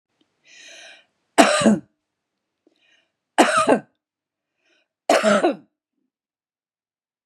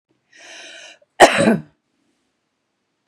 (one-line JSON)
{"three_cough_length": "7.3 s", "three_cough_amplitude": 32768, "three_cough_signal_mean_std_ratio": 0.32, "cough_length": "3.1 s", "cough_amplitude": 32768, "cough_signal_mean_std_ratio": 0.26, "survey_phase": "beta (2021-08-13 to 2022-03-07)", "age": "65+", "gender": "Female", "wearing_mask": "No", "symptom_none": true, "smoker_status": "Ex-smoker", "respiratory_condition_asthma": false, "respiratory_condition_other": false, "recruitment_source": "REACT", "submission_delay": "1 day", "covid_test_result": "Negative", "covid_test_method": "RT-qPCR", "influenza_a_test_result": "Unknown/Void", "influenza_b_test_result": "Unknown/Void"}